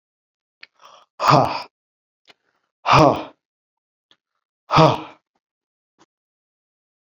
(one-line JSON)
{"exhalation_length": "7.2 s", "exhalation_amplitude": 31980, "exhalation_signal_mean_std_ratio": 0.27, "survey_phase": "beta (2021-08-13 to 2022-03-07)", "age": "45-64", "gender": "Male", "wearing_mask": "No", "symptom_none": true, "smoker_status": "Never smoked", "respiratory_condition_asthma": false, "respiratory_condition_other": false, "recruitment_source": "REACT", "submission_delay": "1 day", "covid_test_result": "Negative", "covid_test_method": "RT-qPCR"}